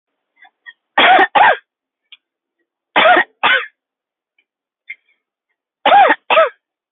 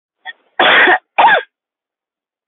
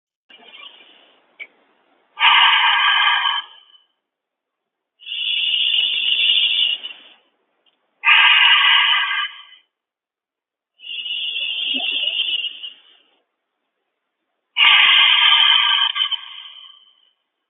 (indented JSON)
{
  "three_cough_length": "6.9 s",
  "three_cough_amplitude": 32768,
  "three_cough_signal_mean_std_ratio": 0.39,
  "cough_length": "2.5 s",
  "cough_amplitude": 29524,
  "cough_signal_mean_std_ratio": 0.45,
  "exhalation_length": "17.5 s",
  "exhalation_amplitude": 29756,
  "exhalation_signal_mean_std_ratio": 0.54,
  "survey_phase": "alpha (2021-03-01 to 2021-08-12)",
  "age": "18-44",
  "gender": "Female",
  "wearing_mask": "No",
  "symptom_none": true,
  "smoker_status": "Current smoker (1 to 10 cigarettes per day)",
  "respiratory_condition_asthma": false,
  "respiratory_condition_other": false,
  "recruitment_source": "REACT",
  "submission_delay": "14 days",
  "covid_test_result": "Negative",
  "covid_test_method": "RT-qPCR"
}